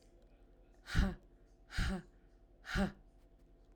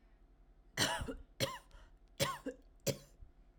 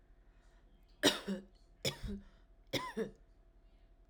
exhalation_length: 3.8 s
exhalation_amplitude: 4086
exhalation_signal_mean_std_ratio: 0.39
cough_length: 3.6 s
cough_amplitude: 4646
cough_signal_mean_std_ratio: 0.44
three_cough_length: 4.1 s
three_cough_amplitude: 5884
three_cough_signal_mean_std_ratio: 0.37
survey_phase: alpha (2021-03-01 to 2021-08-12)
age: 18-44
gender: Female
wearing_mask: 'No'
symptom_headache: true
symptom_onset: 13 days
smoker_status: Never smoked
respiratory_condition_asthma: false
respiratory_condition_other: false
recruitment_source: REACT
submission_delay: 3 days
covid_test_result: Negative
covid_test_method: RT-qPCR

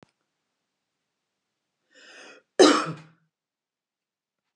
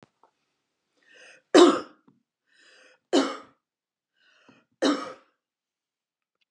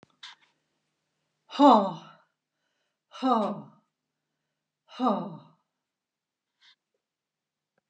cough_length: 4.6 s
cough_amplitude: 24600
cough_signal_mean_std_ratio: 0.19
three_cough_length: 6.5 s
three_cough_amplitude: 24951
three_cough_signal_mean_std_ratio: 0.23
exhalation_length: 7.9 s
exhalation_amplitude: 18297
exhalation_signal_mean_std_ratio: 0.26
survey_phase: beta (2021-08-13 to 2022-03-07)
age: 65+
gender: Female
wearing_mask: 'No'
symptom_none: true
smoker_status: Never smoked
respiratory_condition_asthma: false
respiratory_condition_other: false
recruitment_source: REACT
submission_delay: 3 days
covid_test_result: Negative
covid_test_method: RT-qPCR
influenza_a_test_result: Negative
influenza_b_test_result: Negative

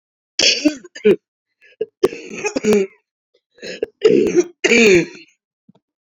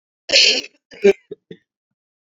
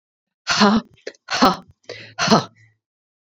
three_cough_length: 6.1 s
three_cough_amplitude: 31513
three_cough_signal_mean_std_ratio: 0.45
cough_length: 2.4 s
cough_amplitude: 32768
cough_signal_mean_std_ratio: 0.33
exhalation_length: 3.2 s
exhalation_amplitude: 29284
exhalation_signal_mean_std_ratio: 0.4
survey_phase: beta (2021-08-13 to 2022-03-07)
age: 45-64
gender: Female
wearing_mask: 'No'
symptom_new_continuous_cough: true
symptom_runny_or_blocked_nose: true
symptom_shortness_of_breath: true
symptom_sore_throat: true
symptom_diarrhoea: true
symptom_fatigue: true
symptom_headache: true
smoker_status: Never smoked
respiratory_condition_asthma: false
respiratory_condition_other: false
recruitment_source: Test and Trace
submission_delay: 1 day
covid_test_result: Positive
covid_test_method: LFT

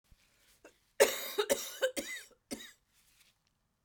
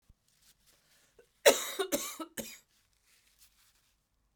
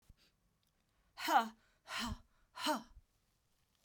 three_cough_length: 3.8 s
three_cough_amplitude: 10719
three_cough_signal_mean_std_ratio: 0.32
cough_length: 4.4 s
cough_amplitude: 14032
cough_signal_mean_std_ratio: 0.23
exhalation_length: 3.8 s
exhalation_amplitude: 4061
exhalation_signal_mean_std_ratio: 0.33
survey_phase: beta (2021-08-13 to 2022-03-07)
age: 45-64
gender: Female
wearing_mask: 'No'
symptom_cough_any: true
symptom_sore_throat: true
symptom_change_to_sense_of_smell_or_taste: true
symptom_other: true
symptom_onset: 5 days
smoker_status: Never smoked
respiratory_condition_asthma: false
respiratory_condition_other: false
recruitment_source: Test and Trace
submission_delay: 2 days
covid_test_result: Positive
covid_test_method: RT-qPCR
covid_ct_value: 20.1
covid_ct_gene: N gene
covid_ct_mean: 20.8
covid_viral_load: 150000 copies/ml
covid_viral_load_category: Low viral load (10K-1M copies/ml)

